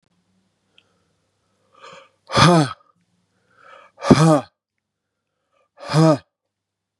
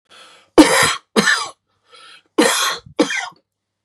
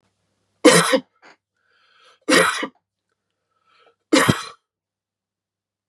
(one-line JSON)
{"exhalation_length": "7.0 s", "exhalation_amplitude": 32768, "exhalation_signal_mean_std_ratio": 0.29, "cough_length": "3.8 s", "cough_amplitude": 32768, "cough_signal_mean_std_ratio": 0.43, "three_cough_length": "5.9 s", "three_cough_amplitude": 32767, "three_cough_signal_mean_std_ratio": 0.3, "survey_phase": "beta (2021-08-13 to 2022-03-07)", "age": "45-64", "gender": "Male", "wearing_mask": "No", "symptom_cough_any": true, "symptom_headache": true, "smoker_status": "Never smoked", "respiratory_condition_asthma": false, "respiratory_condition_other": false, "recruitment_source": "REACT", "submission_delay": "1 day", "covid_test_result": "Negative", "covid_test_method": "RT-qPCR", "influenza_a_test_result": "Negative", "influenza_b_test_result": "Negative"}